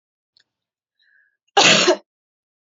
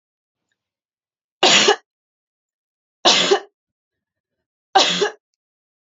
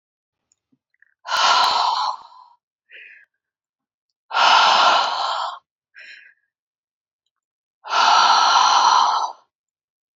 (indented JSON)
{
  "cough_length": "2.6 s",
  "cough_amplitude": 29964,
  "cough_signal_mean_std_ratio": 0.31,
  "three_cough_length": "5.8 s",
  "three_cough_amplitude": 30728,
  "three_cough_signal_mean_std_ratio": 0.32,
  "exhalation_length": "10.2 s",
  "exhalation_amplitude": 24659,
  "exhalation_signal_mean_std_ratio": 0.5,
  "survey_phase": "beta (2021-08-13 to 2022-03-07)",
  "age": "18-44",
  "gender": "Female",
  "wearing_mask": "No",
  "symptom_none": true,
  "smoker_status": "Ex-smoker",
  "respiratory_condition_asthma": false,
  "respiratory_condition_other": false,
  "recruitment_source": "REACT",
  "submission_delay": "6 days",
  "covid_test_result": "Negative",
  "covid_test_method": "RT-qPCR",
  "influenza_a_test_result": "Negative",
  "influenza_b_test_result": "Negative"
}